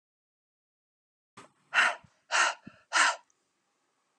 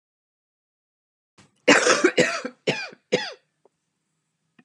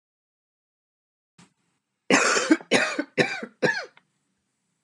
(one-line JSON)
{"exhalation_length": "4.2 s", "exhalation_amplitude": 11184, "exhalation_signal_mean_std_ratio": 0.31, "cough_length": "4.6 s", "cough_amplitude": 25392, "cough_signal_mean_std_ratio": 0.32, "three_cough_length": "4.8 s", "three_cough_amplitude": 25461, "three_cough_signal_mean_std_ratio": 0.36, "survey_phase": "beta (2021-08-13 to 2022-03-07)", "age": "45-64", "gender": "Female", "wearing_mask": "No", "symptom_cough_any": true, "symptom_runny_or_blocked_nose": true, "symptom_onset": "3 days", "smoker_status": "Ex-smoker", "respiratory_condition_asthma": false, "respiratory_condition_other": false, "recruitment_source": "Test and Trace", "submission_delay": "2 days", "covid_test_result": "Positive", "covid_test_method": "RT-qPCR", "covid_ct_value": 18.0, "covid_ct_gene": "ORF1ab gene", "covid_ct_mean": 19.1, "covid_viral_load": "530000 copies/ml", "covid_viral_load_category": "Low viral load (10K-1M copies/ml)"}